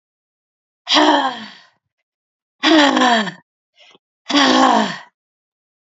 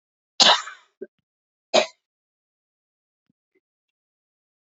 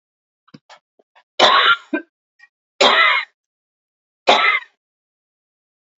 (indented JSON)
{
  "exhalation_length": "6.0 s",
  "exhalation_amplitude": 32767,
  "exhalation_signal_mean_std_ratio": 0.45,
  "cough_length": "4.6 s",
  "cough_amplitude": 26691,
  "cough_signal_mean_std_ratio": 0.2,
  "three_cough_length": "6.0 s",
  "three_cough_amplitude": 32767,
  "three_cough_signal_mean_std_ratio": 0.36,
  "survey_phase": "beta (2021-08-13 to 2022-03-07)",
  "age": "45-64",
  "gender": "Female",
  "wearing_mask": "No",
  "symptom_shortness_of_breath": true,
  "symptom_fatigue": true,
  "symptom_onset": "13 days",
  "smoker_status": "Never smoked",
  "respiratory_condition_asthma": true,
  "respiratory_condition_other": false,
  "recruitment_source": "REACT",
  "submission_delay": "3 days",
  "covid_test_result": "Negative",
  "covid_test_method": "RT-qPCR",
  "influenza_a_test_result": "Negative",
  "influenza_b_test_result": "Negative"
}